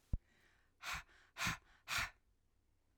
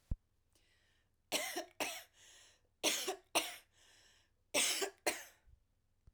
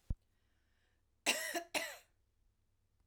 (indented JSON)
{
  "exhalation_length": "3.0 s",
  "exhalation_amplitude": 2007,
  "exhalation_signal_mean_std_ratio": 0.37,
  "three_cough_length": "6.1 s",
  "three_cough_amplitude": 4282,
  "three_cough_signal_mean_std_ratio": 0.39,
  "cough_length": "3.1 s",
  "cough_amplitude": 4309,
  "cough_signal_mean_std_ratio": 0.32,
  "survey_phase": "alpha (2021-03-01 to 2021-08-12)",
  "age": "45-64",
  "gender": "Female",
  "wearing_mask": "No",
  "symptom_none": true,
  "smoker_status": "Never smoked",
  "respiratory_condition_asthma": false,
  "respiratory_condition_other": false,
  "recruitment_source": "REACT",
  "submission_delay": "2 days",
  "covid_test_result": "Negative",
  "covid_test_method": "RT-qPCR"
}